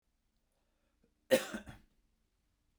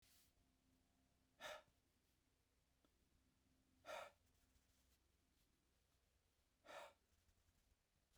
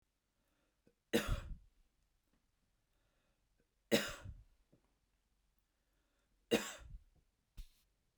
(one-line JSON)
{"cough_length": "2.8 s", "cough_amplitude": 6810, "cough_signal_mean_std_ratio": 0.19, "exhalation_length": "8.2 s", "exhalation_amplitude": 257, "exhalation_signal_mean_std_ratio": 0.35, "three_cough_length": "8.2 s", "three_cough_amplitude": 4784, "three_cough_signal_mean_std_ratio": 0.24, "survey_phase": "beta (2021-08-13 to 2022-03-07)", "age": "45-64", "gender": "Male", "wearing_mask": "No", "symptom_none": true, "smoker_status": "Never smoked", "respiratory_condition_asthma": false, "respiratory_condition_other": false, "recruitment_source": "REACT", "submission_delay": "1 day", "covid_test_result": "Negative", "covid_test_method": "RT-qPCR"}